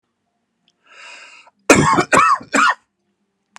{"cough_length": "3.6 s", "cough_amplitude": 32768, "cough_signal_mean_std_ratio": 0.4, "survey_phase": "alpha (2021-03-01 to 2021-08-12)", "age": "45-64", "gender": "Male", "wearing_mask": "No", "symptom_none": true, "smoker_status": "Current smoker (e-cigarettes or vapes only)", "respiratory_condition_asthma": false, "respiratory_condition_other": false, "recruitment_source": "REACT", "submission_delay": "7 days", "covid_test_result": "Negative", "covid_test_method": "RT-qPCR"}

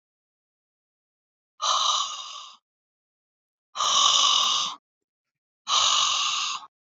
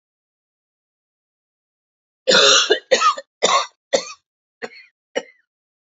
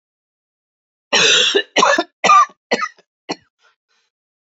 {"exhalation_length": "6.9 s", "exhalation_amplitude": 16769, "exhalation_signal_mean_std_ratio": 0.5, "three_cough_length": "5.9 s", "three_cough_amplitude": 30672, "three_cough_signal_mean_std_ratio": 0.34, "cough_length": "4.4 s", "cough_amplitude": 31789, "cough_signal_mean_std_ratio": 0.41, "survey_phase": "beta (2021-08-13 to 2022-03-07)", "age": "45-64", "gender": "Female", "wearing_mask": "No", "symptom_cough_any": true, "symptom_shortness_of_breath": true, "symptom_sore_throat": true, "symptom_fatigue": true, "symptom_headache": true, "symptom_change_to_sense_of_smell_or_taste": true, "symptom_other": true, "symptom_onset": "6 days", "smoker_status": "Never smoked", "respiratory_condition_asthma": false, "respiratory_condition_other": false, "recruitment_source": "Test and Trace", "submission_delay": "0 days", "covid_test_result": "Positive", "covid_test_method": "RT-qPCR", "covid_ct_value": 22.9, "covid_ct_gene": "ORF1ab gene", "covid_ct_mean": 23.1, "covid_viral_load": "26000 copies/ml", "covid_viral_load_category": "Low viral load (10K-1M copies/ml)"}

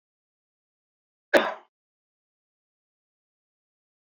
{"cough_length": "4.1 s", "cough_amplitude": 14487, "cough_signal_mean_std_ratio": 0.14, "survey_phase": "beta (2021-08-13 to 2022-03-07)", "age": "65+", "gender": "Male", "wearing_mask": "No", "symptom_none": true, "smoker_status": "Never smoked", "respiratory_condition_asthma": false, "respiratory_condition_other": false, "recruitment_source": "REACT", "submission_delay": "0 days", "covid_test_result": "Negative", "covid_test_method": "RT-qPCR"}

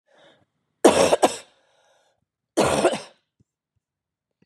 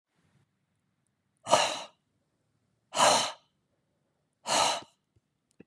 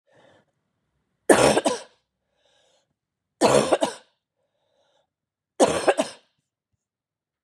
{"cough_length": "4.5 s", "cough_amplitude": 32614, "cough_signal_mean_std_ratio": 0.31, "exhalation_length": "5.7 s", "exhalation_amplitude": 16249, "exhalation_signal_mean_std_ratio": 0.32, "three_cough_length": "7.4 s", "three_cough_amplitude": 30458, "three_cough_signal_mean_std_ratio": 0.3, "survey_phase": "beta (2021-08-13 to 2022-03-07)", "age": "45-64", "gender": "Female", "wearing_mask": "No", "symptom_cough_any": true, "symptom_runny_or_blocked_nose": true, "symptom_onset": "12 days", "smoker_status": "Never smoked", "respiratory_condition_asthma": true, "respiratory_condition_other": false, "recruitment_source": "REACT", "submission_delay": "1 day", "covid_test_result": "Negative", "covid_test_method": "RT-qPCR", "influenza_a_test_result": "Unknown/Void", "influenza_b_test_result": "Unknown/Void"}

